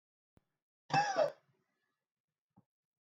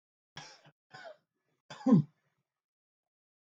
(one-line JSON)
{"cough_length": "3.1 s", "cough_amplitude": 3495, "cough_signal_mean_std_ratio": 0.28, "three_cough_length": "3.6 s", "three_cough_amplitude": 7134, "three_cough_signal_mean_std_ratio": 0.2, "survey_phase": "beta (2021-08-13 to 2022-03-07)", "age": "18-44", "gender": "Male", "wearing_mask": "No", "symptom_change_to_sense_of_smell_or_taste": true, "symptom_onset": "7 days", "smoker_status": "Never smoked", "respiratory_condition_asthma": false, "respiratory_condition_other": false, "recruitment_source": "Test and Trace", "submission_delay": "2 days", "covid_test_result": "Positive", "covid_test_method": "RT-qPCR", "covid_ct_value": 30.7, "covid_ct_gene": "N gene", "covid_ct_mean": 30.8, "covid_viral_load": "81 copies/ml", "covid_viral_load_category": "Minimal viral load (< 10K copies/ml)"}